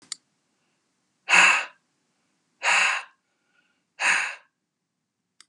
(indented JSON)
{
  "exhalation_length": "5.5 s",
  "exhalation_amplitude": 24095,
  "exhalation_signal_mean_std_ratio": 0.33,
  "survey_phase": "beta (2021-08-13 to 2022-03-07)",
  "age": "65+",
  "gender": "Male",
  "wearing_mask": "No",
  "symptom_none": true,
  "smoker_status": "Never smoked",
  "respiratory_condition_asthma": false,
  "respiratory_condition_other": false,
  "recruitment_source": "REACT",
  "submission_delay": "1 day",
  "covid_test_result": "Negative",
  "covid_test_method": "RT-qPCR",
  "influenza_a_test_result": "Negative",
  "influenza_b_test_result": "Negative"
}